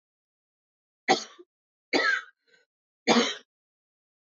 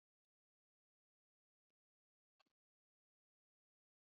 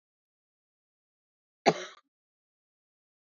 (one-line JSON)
{"three_cough_length": "4.3 s", "three_cough_amplitude": 12863, "three_cough_signal_mean_std_ratio": 0.31, "exhalation_length": "4.2 s", "exhalation_amplitude": 30, "exhalation_signal_mean_std_ratio": 0.07, "cough_length": "3.3 s", "cough_amplitude": 13230, "cough_signal_mean_std_ratio": 0.13, "survey_phase": "alpha (2021-03-01 to 2021-08-12)", "age": "18-44", "gender": "Female", "wearing_mask": "No", "symptom_cough_any": true, "symptom_fatigue": true, "symptom_headache": true, "symptom_change_to_sense_of_smell_or_taste": true, "smoker_status": "Never smoked", "respiratory_condition_asthma": true, "respiratory_condition_other": false, "recruitment_source": "Test and Trace", "submission_delay": "2 days", "covid_test_result": "Positive", "covid_test_method": "RT-qPCR", "covid_ct_value": 17.6, "covid_ct_gene": "ORF1ab gene", "covid_ct_mean": 17.8, "covid_viral_load": "1500000 copies/ml", "covid_viral_load_category": "High viral load (>1M copies/ml)"}